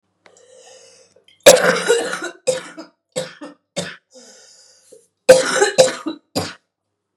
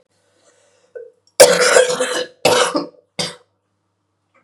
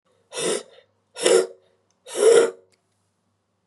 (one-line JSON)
{"cough_length": "7.2 s", "cough_amplitude": 32768, "cough_signal_mean_std_ratio": 0.34, "three_cough_length": "4.4 s", "three_cough_amplitude": 32768, "three_cough_signal_mean_std_ratio": 0.4, "exhalation_length": "3.7 s", "exhalation_amplitude": 26764, "exhalation_signal_mean_std_ratio": 0.37, "survey_phase": "beta (2021-08-13 to 2022-03-07)", "age": "18-44", "gender": "Female", "wearing_mask": "No", "symptom_cough_any": true, "symptom_new_continuous_cough": true, "symptom_runny_or_blocked_nose": true, "symptom_shortness_of_breath": true, "symptom_sore_throat": true, "symptom_abdominal_pain": true, "symptom_fatigue": true, "symptom_fever_high_temperature": true, "symptom_headache": true, "symptom_change_to_sense_of_smell_or_taste": true, "symptom_loss_of_taste": true, "symptom_onset": "2 days", "smoker_status": "Ex-smoker", "respiratory_condition_asthma": false, "respiratory_condition_other": false, "recruitment_source": "Test and Trace", "submission_delay": "2 days", "covid_test_result": "Positive", "covid_test_method": "LFT"}